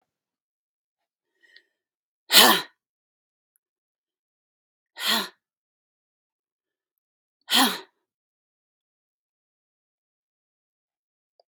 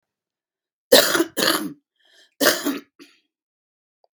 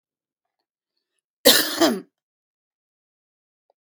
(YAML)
exhalation_length: 11.5 s
exhalation_amplitude: 31762
exhalation_signal_mean_std_ratio: 0.18
cough_length: 4.2 s
cough_amplitude: 32767
cough_signal_mean_std_ratio: 0.34
three_cough_length: 3.9 s
three_cough_amplitude: 32767
three_cough_signal_mean_std_ratio: 0.24
survey_phase: beta (2021-08-13 to 2022-03-07)
age: 65+
gender: Female
wearing_mask: 'No'
symptom_cough_any: true
smoker_status: Ex-smoker
respiratory_condition_asthma: false
respiratory_condition_other: true
recruitment_source: REACT
submission_delay: 2 days
covid_test_result: Negative
covid_test_method: RT-qPCR